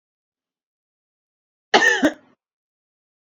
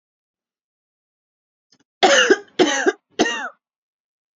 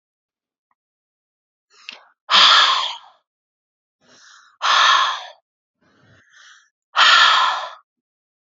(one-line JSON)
{"cough_length": "3.2 s", "cough_amplitude": 26947, "cough_signal_mean_std_ratio": 0.25, "three_cough_length": "4.4 s", "three_cough_amplitude": 28906, "three_cough_signal_mean_std_ratio": 0.34, "exhalation_length": "8.5 s", "exhalation_amplitude": 30594, "exhalation_signal_mean_std_ratio": 0.38, "survey_phase": "beta (2021-08-13 to 2022-03-07)", "age": "18-44", "gender": "Female", "wearing_mask": "No", "symptom_cough_any": true, "symptom_onset": "5 days", "smoker_status": "Ex-smoker", "respiratory_condition_asthma": false, "respiratory_condition_other": false, "recruitment_source": "REACT", "submission_delay": "1 day", "covid_test_result": "Negative", "covid_test_method": "RT-qPCR", "influenza_a_test_result": "Negative", "influenza_b_test_result": "Negative"}